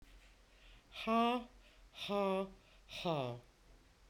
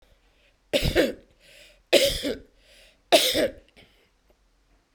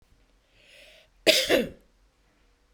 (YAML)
exhalation_length: 4.1 s
exhalation_amplitude: 2656
exhalation_signal_mean_std_ratio: 0.48
three_cough_length: 4.9 s
three_cough_amplitude: 23054
three_cough_signal_mean_std_ratio: 0.37
cough_length: 2.7 s
cough_amplitude: 23204
cough_signal_mean_std_ratio: 0.3
survey_phase: beta (2021-08-13 to 2022-03-07)
age: 65+
gender: Female
wearing_mask: 'No'
symptom_none: true
smoker_status: Ex-smoker
respiratory_condition_asthma: false
respiratory_condition_other: false
recruitment_source: REACT
submission_delay: 3 days
covid_test_result: Negative
covid_test_method: RT-qPCR
influenza_a_test_result: Negative
influenza_b_test_result: Negative